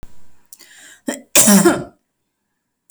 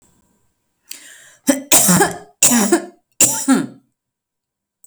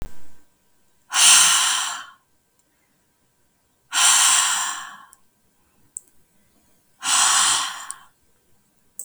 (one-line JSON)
{"cough_length": "2.9 s", "cough_amplitude": 32768, "cough_signal_mean_std_ratio": 0.37, "three_cough_length": "4.9 s", "three_cough_amplitude": 32768, "three_cough_signal_mean_std_ratio": 0.43, "exhalation_length": "9.0 s", "exhalation_amplitude": 32436, "exhalation_signal_mean_std_ratio": 0.44, "survey_phase": "beta (2021-08-13 to 2022-03-07)", "age": "18-44", "gender": "Female", "wearing_mask": "No", "symptom_sore_throat": true, "symptom_headache": true, "smoker_status": "Never smoked", "respiratory_condition_asthma": true, "respiratory_condition_other": false, "recruitment_source": "REACT", "submission_delay": "1 day", "covid_test_result": "Negative", "covid_test_method": "RT-qPCR", "influenza_a_test_result": "Negative", "influenza_b_test_result": "Negative"}